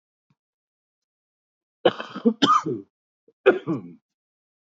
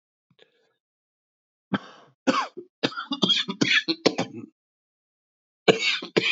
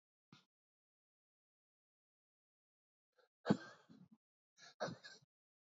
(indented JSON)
{
  "cough_length": "4.6 s",
  "cough_amplitude": 25229,
  "cough_signal_mean_std_ratio": 0.3,
  "three_cough_length": "6.3 s",
  "three_cough_amplitude": 24266,
  "three_cough_signal_mean_std_ratio": 0.38,
  "exhalation_length": "5.7 s",
  "exhalation_amplitude": 3512,
  "exhalation_signal_mean_std_ratio": 0.16,
  "survey_phase": "alpha (2021-03-01 to 2021-08-12)",
  "age": "18-44",
  "gender": "Male",
  "wearing_mask": "No",
  "symptom_cough_any": true,
  "symptom_shortness_of_breath": true,
  "symptom_fatigue": true,
  "symptom_fever_high_temperature": true,
  "symptom_change_to_sense_of_smell_or_taste": true,
  "symptom_loss_of_taste": true,
  "symptom_onset": "4 days",
  "smoker_status": "Ex-smoker",
  "respiratory_condition_asthma": false,
  "respiratory_condition_other": false,
  "recruitment_source": "Test and Trace",
  "submission_delay": "1 day",
  "covid_test_result": "Positive",
  "covid_test_method": "ePCR"
}